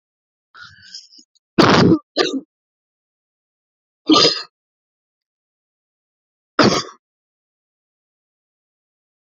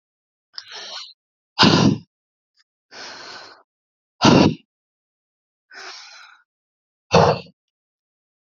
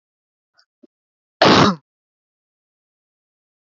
{
  "three_cough_length": "9.4 s",
  "three_cough_amplitude": 32313,
  "three_cough_signal_mean_std_ratio": 0.27,
  "exhalation_length": "8.5 s",
  "exhalation_amplitude": 29130,
  "exhalation_signal_mean_std_ratio": 0.29,
  "cough_length": "3.7 s",
  "cough_amplitude": 31011,
  "cough_signal_mean_std_ratio": 0.24,
  "survey_phase": "beta (2021-08-13 to 2022-03-07)",
  "age": "45-64",
  "gender": "Female",
  "wearing_mask": "No",
  "symptom_none": true,
  "smoker_status": "Never smoked",
  "respiratory_condition_asthma": false,
  "respiratory_condition_other": false,
  "recruitment_source": "REACT",
  "submission_delay": "1 day",
  "covid_test_result": "Negative",
  "covid_test_method": "RT-qPCR"
}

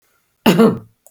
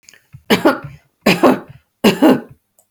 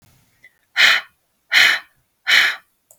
{
  "cough_length": "1.1 s",
  "cough_amplitude": 32768,
  "cough_signal_mean_std_ratio": 0.43,
  "three_cough_length": "2.9 s",
  "three_cough_amplitude": 32768,
  "three_cough_signal_mean_std_ratio": 0.43,
  "exhalation_length": "3.0 s",
  "exhalation_amplitude": 32768,
  "exhalation_signal_mean_std_ratio": 0.41,
  "survey_phase": "beta (2021-08-13 to 2022-03-07)",
  "age": "65+",
  "gender": "Female",
  "wearing_mask": "No",
  "symptom_none": true,
  "smoker_status": "Ex-smoker",
  "respiratory_condition_asthma": false,
  "respiratory_condition_other": false,
  "recruitment_source": "Test and Trace",
  "submission_delay": "1 day",
  "covid_test_result": "Negative",
  "covid_test_method": "RT-qPCR"
}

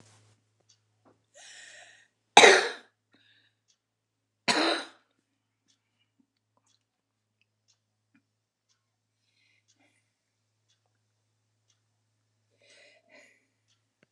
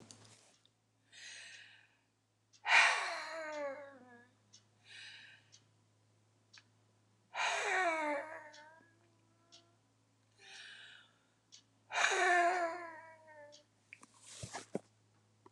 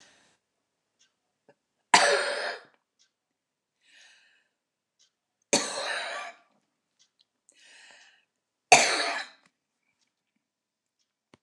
{
  "cough_length": "14.1 s",
  "cough_amplitude": 29202,
  "cough_signal_mean_std_ratio": 0.15,
  "exhalation_length": "15.5 s",
  "exhalation_amplitude": 6648,
  "exhalation_signal_mean_std_ratio": 0.37,
  "three_cough_length": "11.4 s",
  "three_cough_amplitude": 26321,
  "three_cough_signal_mean_std_ratio": 0.25,
  "survey_phase": "alpha (2021-03-01 to 2021-08-12)",
  "age": "65+",
  "gender": "Female",
  "wearing_mask": "No",
  "symptom_cough_any": true,
  "symptom_shortness_of_breath": true,
  "symptom_fatigue": true,
  "smoker_status": "Ex-smoker",
  "respiratory_condition_asthma": true,
  "respiratory_condition_other": true,
  "recruitment_source": "REACT",
  "submission_delay": "11 days",
  "covid_test_result": "Negative",
  "covid_test_method": "RT-qPCR"
}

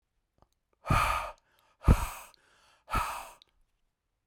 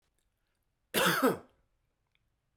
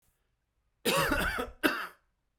{
  "exhalation_length": "4.3 s",
  "exhalation_amplitude": 13155,
  "exhalation_signal_mean_std_ratio": 0.33,
  "cough_length": "2.6 s",
  "cough_amplitude": 7005,
  "cough_signal_mean_std_ratio": 0.32,
  "three_cough_length": "2.4 s",
  "three_cough_amplitude": 9423,
  "three_cough_signal_mean_std_ratio": 0.49,
  "survey_phase": "beta (2021-08-13 to 2022-03-07)",
  "age": "18-44",
  "gender": "Male",
  "wearing_mask": "No",
  "symptom_cough_any": true,
  "symptom_sore_throat": true,
  "symptom_abdominal_pain": true,
  "symptom_fatigue": true,
  "symptom_change_to_sense_of_smell_or_taste": true,
  "symptom_loss_of_taste": true,
  "symptom_onset": "4 days",
  "smoker_status": "Current smoker (1 to 10 cigarettes per day)",
  "respiratory_condition_asthma": false,
  "respiratory_condition_other": false,
  "recruitment_source": "Test and Trace",
  "submission_delay": "2 days",
  "covid_test_result": "Positive",
  "covid_test_method": "RT-qPCR",
  "covid_ct_value": 21.7,
  "covid_ct_gene": "ORF1ab gene"
}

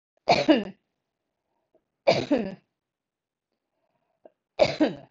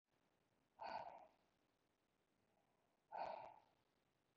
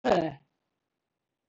{
  "three_cough_length": "5.1 s",
  "three_cough_amplitude": 17062,
  "three_cough_signal_mean_std_ratio": 0.31,
  "exhalation_length": "4.4 s",
  "exhalation_amplitude": 434,
  "exhalation_signal_mean_std_ratio": 0.37,
  "cough_length": "1.5 s",
  "cough_amplitude": 8051,
  "cough_signal_mean_std_ratio": 0.32,
  "survey_phase": "beta (2021-08-13 to 2022-03-07)",
  "age": "65+",
  "gender": "Female",
  "wearing_mask": "No",
  "symptom_none": true,
  "symptom_onset": "7 days",
  "smoker_status": "Ex-smoker",
  "respiratory_condition_asthma": false,
  "respiratory_condition_other": false,
  "recruitment_source": "REACT",
  "submission_delay": "11 days",
  "covid_test_result": "Negative",
  "covid_test_method": "RT-qPCR",
  "influenza_a_test_result": "Negative",
  "influenza_b_test_result": "Negative"
}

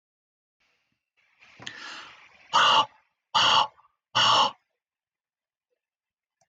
{
  "exhalation_length": "6.5 s",
  "exhalation_amplitude": 12529,
  "exhalation_signal_mean_std_ratio": 0.34,
  "survey_phase": "beta (2021-08-13 to 2022-03-07)",
  "age": "45-64",
  "gender": "Male",
  "wearing_mask": "No",
  "symptom_none": true,
  "smoker_status": "Never smoked",
  "respiratory_condition_asthma": false,
  "respiratory_condition_other": false,
  "recruitment_source": "REACT",
  "submission_delay": "0 days",
  "covid_test_result": "Negative",
  "covid_test_method": "RT-qPCR"
}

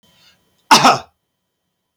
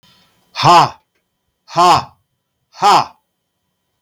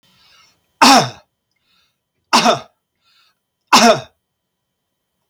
{
  "cough_length": "2.0 s",
  "cough_amplitude": 32768,
  "cough_signal_mean_std_ratio": 0.29,
  "exhalation_length": "4.0 s",
  "exhalation_amplitude": 32768,
  "exhalation_signal_mean_std_ratio": 0.38,
  "three_cough_length": "5.3 s",
  "three_cough_amplitude": 32768,
  "three_cough_signal_mean_std_ratio": 0.31,
  "survey_phase": "beta (2021-08-13 to 2022-03-07)",
  "age": "65+",
  "gender": "Male",
  "wearing_mask": "No",
  "symptom_none": true,
  "smoker_status": "Ex-smoker",
  "respiratory_condition_asthma": false,
  "respiratory_condition_other": false,
  "recruitment_source": "REACT",
  "submission_delay": "2 days",
  "covid_test_result": "Negative",
  "covid_test_method": "RT-qPCR",
  "influenza_a_test_result": "Negative",
  "influenza_b_test_result": "Negative"
}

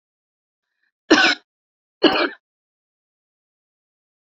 {
  "three_cough_length": "4.3 s",
  "three_cough_amplitude": 27578,
  "three_cough_signal_mean_std_ratio": 0.26,
  "survey_phase": "beta (2021-08-13 to 2022-03-07)",
  "age": "18-44",
  "gender": "Female",
  "wearing_mask": "No",
  "symptom_runny_or_blocked_nose": true,
  "symptom_sore_throat": true,
  "symptom_fatigue": true,
  "symptom_headache": true,
  "symptom_other": true,
  "smoker_status": "Ex-smoker",
  "respiratory_condition_asthma": false,
  "respiratory_condition_other": false,
  "recruitment_source": "Test and Trace",
  "submission_delay": "1 day",
  "covid_test_result": "Positive",
  "covid_test_method": "RT-qPCR",
  "covid_ct_value": 27.7,
  "covid_ct_gene": "N gene",
  "covid_ct_mean": 28.0,
  "covid_viral_load": "660 copies/ml",
  "covid_viral_load_category": "Minimal viral load (< 10K copies/ml)"
}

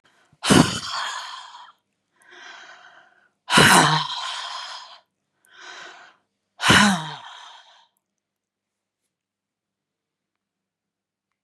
{
  "exhalation_length": "11.4 s",
  "exhalation_amplitude": 30833,
  "exhalation_signal_mean_std_ratio": 0.32,
  "survey_phase": "beta (2021-08-13 to 2022-03-07)",
  "age": "65+",
  "gender": "Female",
  "wearing_mask": "No",
  "symptom_abdominal_pain": true,
  "symptom_fatigue": true,
  "symptom_headache": true,
  "smoker_status": "Never smoked",
  "respiratory_condition_asthma": false,
  "respiratory_condition_other": false,
  "recruitment_source": "Test and Trace",
  "submission_delay": "3 days",
  "covid_test_result": "Positive",
  "covid_test_method": "RT-qPCR",
  "covid_ct_value": 30.1,
  "covid_ct_gene": "ORF1ab gene"
}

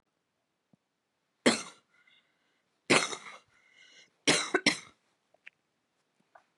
{
  "three_cough_length": "6.6 s",
  "three_cough_amplitude": 16221,
  "three_cough_signal_mean_std_ratio": 0.25,
  "survey_phase": "beta (2021-08-13 to 2022-03-07)",
  "age": "18-44",
  "gender": "Female",
  "wearing_mask": "No",
  "symptom_cough_any": true,
  "symptom_sore_throat": true,
  "smoker_status": "Never smoked",
  "respiratory_condition_asthma": false,
  "respiratory_condition_other": false,
  "recruitment_source": "REACT",
  "submission_delay": "1 day",
  "covid_test_result": "Negative",
  "covid_test_method": "RT-qPCR",
  "covid_ct_value": 39.0,
  "covid_ct_gene": "N gene",
  "influenza_a_test_result": "Negative",
  "influenza_b_test_result": "Negative"
}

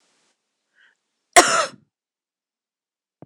{
  "cough_length": "3.3 s",
  "cough_amplitude": 26028,
  "cough_signal_mean_std_ratio": 0.2,
  "survey_phase": "beta (2021-08-13 to 2022-03-07)",
  "age": "45-64",
  "gender": "Female",
  "wearing_mask": "No",
  "symptom_cough_any": true,
  "symptom_runny_or_blocked_nose": true,
  "symptom_headache": true,
  "symptom_onset": "3 days",
  "smoker_status": "Never smoked",
  "respiratory_condition_asthma": false,
  "respiratory_condition_other": false,
  "recruitment_source": "Test and Trace",
  "submission_delay": "1 day",
  "covid_test_result": "Positive",
  "covid_test_method": "RT-qPCR",
  "covid_ct_value": 21.4,
  "covid_ct_gene": "ORF1ab gene",
  "covid_ct_mean": 21.6,
  "covid_viral_load": "83000 copies/ml",
  "covid_viral_load_category": "Low viral load (10K-1M copies/ml)"
}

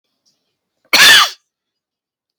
{
  "cough_length": "2.4 s",
  "cough_amplitude": 32768,
  "cough_signal_mean_std_ratio": 0.33,
  "survey_phase": "beta (2021-08-13 to 2022-03-07)",
  "age": "18-44",
  "gender": "Male",
  "wearing_mask": "No",
  "symptom_cough_any": true,
  "symptom_runny_or_blocked_nose": true,
  "symptom_headache": true,
  "symptom_other": true,
  "smoker_status": "Never smoked",
  "respiratory_condition_asthma": false,
  "respiratory_condition_other": false,
  "recruitment_source": "Test and Trace",
  "submission_delay": "0 days",
  "covid_test_result": "Positive",
  "covid_test_method": "LFT"
}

